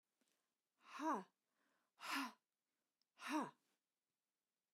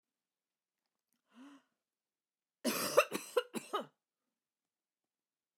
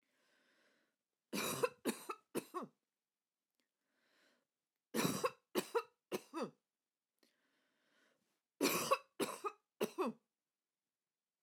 exhalation_length: 4.7 s
exhalation_amplitude: 823
exhalation_signal_mean_std_ratio: 0.33
cough_length: 5.6 s
cough_amplitude: 8128
cough_signal_mean_std_ratio: 0.24
three_cough_length: 11.4 s
three_cough_amplitude: 3333
three_cough_signal_mean_std_ratio: 0.34
survey_phase: alpha (2021-03-01 to 2021-08-12)
age: 45-64
gender: Female
wearing_mask: 'No'
symptom_none: true
smoker_status: Ex-smoker
respiratory_condition_asthma: false
respiratory_condition_other: false
recruitment_source: REACT
submission_delay: 1 day
covid_test_result: Negative
covid_test_method: RT-qPCR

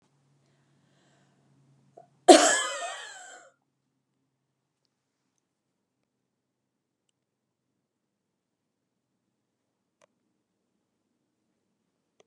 cough_length: 12.3 s
cough_amplitude: 30046
cough_signal_mean_std_ratio: 0.13
survey_phase: beta (2021-08-13 to 2022-03-07)
age: 65+
gender: Female
wearing_mask: 'No'
symptom_none: true
smoker_status: Never smoked
respiratory_condition_asthma: false
respiratory_condition_other: false
recruitment_source: REACT
submission_delay: 2 days
covid_test_result: Negative
covid_test_method: RT-qPCR
influenza_a_test_result: Negative
influenza_b_test_result: Negative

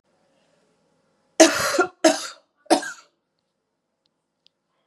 three_cough_length: 4.9 s
three_cough_amplitude: 32693
three_cough_signal_mean_std_ratio: 0.27
survey_phase: beta (2021-08-13 to 2022-03-07)
age: 45-64
gender: Female
wearing_mask: 'No'
symptom_runny_or_blocked_nose: true
symptom_sore_throat: true
symptom_fatigue: true
symptom_headache: true
symptom_onset: 1 day
smoker_status: Never smoked
respiratory_condition_asthma: false
respiratory_condition_other: false
recruitment_source: Test and Trace
submission_delay: 1 day
covid_test_result: Positive
covid_test_method: RT-qPCR
covid_ct_value: 24.4
covid_ct_gene: N gene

